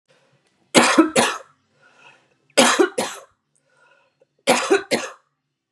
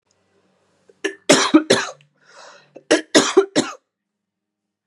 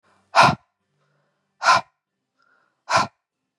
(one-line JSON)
{"three_cough_length": "5.7 s", "three_cough_amplitude": 32767, "three_cough_signal_mean_std_ratio": 0.38, "cough_length": "4.9 s", "cough_amplitude": 32766, "cough_signal_mean_std_ratio": 0.33, "exhalation_length": "3.6 s", "exhalation_amplitude": 30782, "exhalation_signal_mean_std_ratio": 0.29, "survey_phase": "beta (2021-08-13 to 2022-03-07)", "age": "45-64", "gender": "Female", "wearing_mask": "No", "symptom_cough_any": true, "symptom_runny_or_blocked_nose": true, "smoker_status": "Never smoked", "respiratory_condition_asthma": false, "respiratory_condition_other": false, "recruitment_source": "REACT", "submission_delay": "1 day", "covid_test_result": "Negative", "covid_test_method": "RT-qPCR"}